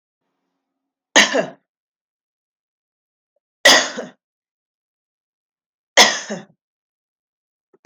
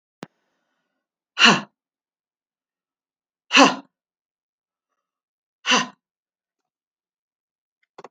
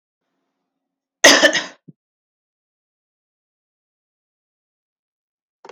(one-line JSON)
{"three_cough_length": "7.9 s", "three_cough_amplitude": 32768, "three_cough_signal_mean_std_ratio": 0.23, "exhalation_length": "8.1 s", "exhalation_amplitude": 32768, "exhalation_signal_mean_std_ratio": 0.2, "cough_length": "5.7 s", "cough_amplitude": 32768, "cough_signal_mean_std_ratio": 0.19, "survey_phase": "beta (2021-08-13 to 2022-03-07)", "age": "45-64", "gender": "Female", "wearing_mask": "No", "symptom_none": true, "symptom_onset": "12 days", "smoker_status": "Never smoked", "respiratory_condition_asthma": false, "respiratory_condition_other": false, "recruitment_source": "REACT", "submission_delay": "3 days", "covid_test_result": "Negative", "covid_test_method": "RT-qPCR", "influenza_a_test_result": "Negative", "influenza_b_test_result": "Negative"}